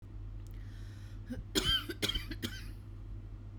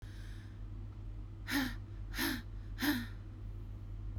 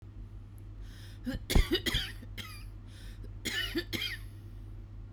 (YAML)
three_cough_length: 3.6 s
three_cough_amplitude: 5364
three_cough_signal_mean_std_ratio: 0.76
exhalation_length: 4.2 s
exhalation_amplitude: 2749
exhalation_signal_mean_std_ratio: 0.93
cough_length: 5.1 s
cough_amplitude: 8731
cough_signal_mean_std_ratio: 0.59
survey_phase: beta (2021-08-13 to 2022-03-07)
age: 18-44
gender: Female
wearing_mask: 'No'
symptom_sore_throat: true
symptom_onset: 2 days
smoker_status: Never smoked
respiratory_condition_asthma: true
respiratory_condition_other: false
recruitment_source: Test and Trace
submission_delay: 1 day
covid_test_result: Negative
covid_test_method: RT-qPCR